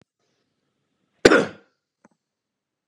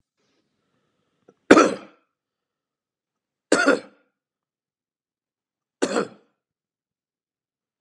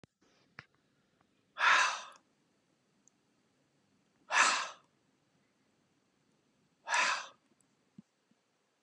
{
  "cough_length": "2.9 s",
  "cough_amplitude": 32768,
  "cough_signal_mean_std_ratio": 0.19,
  "three_cough_length": "7.8 s",
  "three_cough_amplitude": 32768,
  "three_cough_signal_mean_std_ratio": 0.2,
  "exhalation_length": "8.8 s",
  "exhalation_amplitude": 8317,
  "exhalation_signal_mean_std_ratio": 0.28,
  "survey_phase": "beta (2021-08-13 to 2022-03-07)",
  "age": "65+",
  "gender": "Male",
  "wearing_mask": "No",
  "symptom_none": true,
  "smoker_status": "Never smoked",
  "respiratory_condition_asthma": false,
  "respiratory_condition_other": false,
  "recruitment_source": "REACT",
  "submission_delay": "0 days",
  "covid_test_result": "Negative",
  "covid_test_method": "RT-qPCR",
  "influenza_a_test_result": "Unknown/Void",
  "influenza_b_test_result": "Unknown/Void"
}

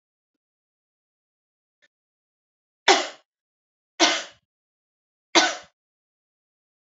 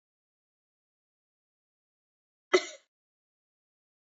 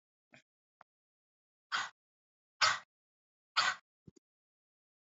{
  "three_cough_length": "6.8 s",
  "three_cough_amplitude": 28748,
  "three_cough_signal_mean_std_ratio": 0.21,
  "cough_length": "4.1 s",
  "cough_amplitude": 13007,
  "cough_signal_mean_std_ratio": 0.11,
  "exhalation_length": "5.1 s",
  "exhalation_amplitude": 6096,
  "exhalation_signal_mean_std_ratio": 0.23,
  "survey_phase": "beta (2021-08-13 to 2022-03-07)",
  "age": "18-44",
  "gender": "Female",
  "wearing_mask": "No",
  "symptom_cough_any": true,
  "symptom_runny_or_blocked_nose": true,
  "symptom_sore_throat": true,
  "symptom_fatigue": true,
  "symptom_headache": true,
  "symptom_loss_of_taste": true,
  "symptom_onset": "2 days",
  "smoker_status": "Never smoked",
  "respiratory_condition_asthma": false,
  "respiratory_condition_other": false,
  "recruitment_source": "Test and Trace",
  "submission_delay": "0 days",
  "covid_test_result": "Positive",
  "covid_test_method": "RT-qPCR",
  "covid_ct_value": 29.1,
  "covid_ct_gene": "ORF1ab gene"
}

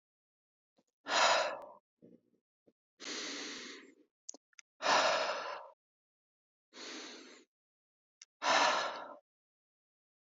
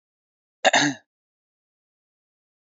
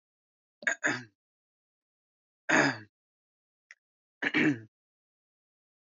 {
  "exhalation_length": "10.3 s",
  "exhalation_amplitude": 5158,
  "exhalation_signal_mean_std_ratio": 0.37,
  "cough_length": "2.7 s",
  "cough_amplitude": 21060,
  "cough_signal_mean_std_ratio": 0.23,
  "three_cough_length": "5.9 s",
  "three_cough_amplitude": 9549,
  "three_cough_signal_mean_std_ratio": 0.29,
  "survey_phase": "beta (2021-08-13 to 2022-03-07)",
  "age": "18-44",
  "gender": "Male",
  "wearing_mask": "No",
  "symptom_none": true,
  "smoker_status": "Ex-smoker",
  "respiratory_condition_asthma": false,
  "respiratory_condition_other": false,
  "recruitment_source": "REACT",
  "submission_delay": "0 days",
  "covid_test_result": "Negative",
  "covid_test_method": "RT-qPCR"
}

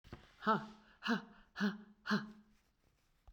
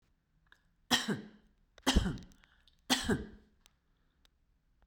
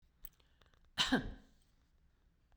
{
  "exhalation_length": "3.3 s",
  "exhalation_amplitude": 2909,
  "exhalation_signal_mean_std_ratio": 0.41,
  "three_cough_length": "4.9 s",
  "three_cough_amplitude": 7384,
  "three_cough_signal_mean_std_ratio": 0.33,
  "cough_length": "2.6 s",
  "cough_amplitude": 3793,
  "cough_signal_mean_std_ratio": 0.29,
  "survey_phase": "beta (2021-08-13 to 2022-03-07)",
  "age": "65+",
  "gender": "Female",
  "wearing_mask": "No",
  "symptom_none": true,
  "smoker_status": "Ex-smoker",
  "respiratory_condition_asthma": false,
  "respiratory_condition_other": false,
  "recruitment_source": "Test and Trace",
  "submission_delay": "2 days",
  "covid_test_result": "Negative",
  "covid_test_method": "RT-qPCR"
}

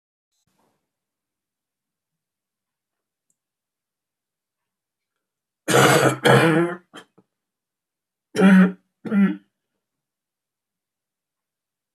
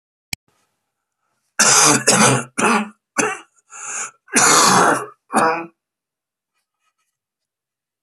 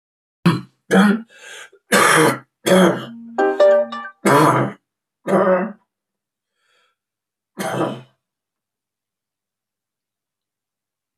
{
  "cough_length": "11.9 s",
  "cough_amplitude": 27698,
  "cough_signal_mean_std_ratio": 0.29,
  "exhalation_length": "8.0 s",
  "exhalation_amplitude": 32768,
  "exhalation_signal_mean_std_ratio": 0.44,
  "three_cough_length": "11.2 s",
  "three_cough_amplitude": 28605,
  "three_cough_signal_mean_std_ratio": 0.43,
  "survey_phase": "beta (2021-08-13 to 2022-03-07)",
  "age": "65+",
  "gender": "Male",
  "wearing_mask": "No",
  "symptom_cough_any": true,
  "symptom_shortness_of_breath": true,
  "symptom_sore_throat": true,
  "symptom_fatigue": true,
  "symptom_fever_high_temperature": true,
  "symptom_headache": true,
  "symptom_onset": "7 days",
  "smoker_status": "Never smoked",
  "respiratory_condition_asthma": false,
  "respiratory_condition_other": false,
  "recruitment_source": "Test and Trace",
  "submission_delay": "1 day",
  "covid_test_result": "Positive",
  "covid_test_method": "RT-qPCR",
  "covid_ct_value": 18.4,
  "covid_ct_gene": "ORF1ab gene",
  "covid_ct_mean": 19.2,
  "covid_viral_load": "520000 copies/ml",
  "covid_viral_load_category": "Low viral load (10K-1M copies/ml)"
}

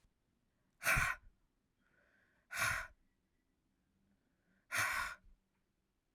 {
  "exhalation_length": "6.1 s",
  "exhalation_amplitude": 2972,
  "exhalation_signal_mean_std_ratio": 0.33,
  "survey_phase": "alpha (2021-03-01 to 2021-08-12)",
  "age": "18-44",
  "gender": "Female",
  "wearing_mask": "No",
  "symptom_cough_any": true,
  "symptom_new_continuous_cough": true,
  "symptom_shortness_of_breath": true,
  "symptom_fatigue": true,
  "symptom_fever_high_temperature": true,
  "symptom_headache": true,
  "symptom_change_to_sense_of_smell_or_taste": true,
  "symptom_loss_of_taste": true,
  "symptom_onset": "5 days",
  "smoker_status": "Never smoked",
  "respiratory_condition_asthma": false,
  "respiratory_condition_other": false,
  "recruitment_source": "Test and Trace",
  "submission_delay": "2 days",
  "covid_test_result": "Positive",
  "covid_test_method": "RT-qPCR",
  "covid_ct_value": 23.0,
  "covid_ct_gene": "N gene"
}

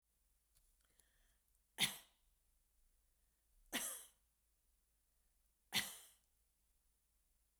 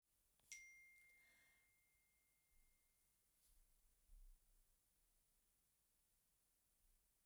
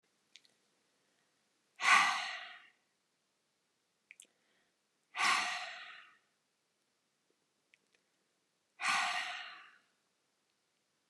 {
  "three_cough_length": "7.6 s",
  "three_cough_amplitude": 2319,
  "three_cough_signal_mean_std_ratio": 0.23,
  "cough_length": "7.3 s",
  "cough_amplitude": 321,
  "cough_signal_mean_std_ratio": 0.59,
  "exhalation_length": "11.1 s",
  "exhalation_amplitude": 6760,
  "exhalation_signal_mean_std_ratio": 0.29,
  "survey_phase": "beta (2021-08-13 to 2022-03-07)",
  "age": "65+",
  "gender": "Female",
  "wearing_mask": "No",
  "symptom_none": true,
  "symptom_onset": "4 days",
  "smoker_status": "Ex-smoker",
  "respiratory_condition_asthma": false,
  "respiratory_condition_other": false,
  "recruitment_source": "REACT",
  "submission_delay": "3 days",
  "covid_test_result": "Negative",
  "covid_test_method": "RT-qPCR"
}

